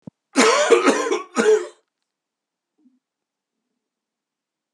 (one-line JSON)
{"cough_length": "4.7 s", "cough_amplitude": 29267, "cough_signal_mean_std_ratio": 0.38, "survey_phase": "beta (2021-08-13 to 2022-03-07)", "age": "65+", "gender": "Male", "wearing_mask": "No", "symptom_cough_any": true, "symptom_runny_or_blocked_nose": true, "symptom_sore_throat": true, "symptom_fever_high_temperature": true, "symptom_onset": "3 days", "smoker_status": "Ex-smoker", "respiratory_condition_asthma": false, "respiratory_condition_other": false, "recruitment_source": "Test and Trace", "submission_delay": "2 days", "covid_test_result": "Positive", "covid_test_method": "RT-qPCR", "covid_ct_value": 20.0, "covid_ct_gene": "ORF1ab gene", "covid_ct_mean": 20.1, "covid_viral_load": "250000 copies/ml", "covid_viral_load_category": "Low viral load (10K-1M copies/ml)"}